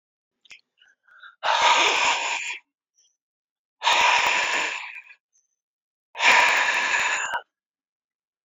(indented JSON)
{
  "exhalation_length": "8.4 s",
  "exhalation_amplitude": 21773,
  "exhalation_signal_mean_std_ratio": 0.52,
  "survey_phase": "alpha (2021-03-01 to 2021-08-12)",
  "age": "45-64",
  "gender": "Male",
  "wearing_mask": "No",
  "symptom_cough_any": true,
  "symptom_new_continuous_cough": true,
  "symptom_abdominal_pain": true,
  "symptom_fatigue": true,
  "symptom_headache": true,
  "symptom_change_to_sense_of_smell_or_taste": true,
  "symptom_loss_of_taste": true,
  "smoker_status": "Never smoked",
  "respiratory_condition_asthma": false,
  "respiratory_condition_other": false,
  "recruitment_source": "Test and Trace",
  "submission_delay": "14 days",
  "covid_test_result": "Negative",
  "covid_test_method": "RT-qPCR"
}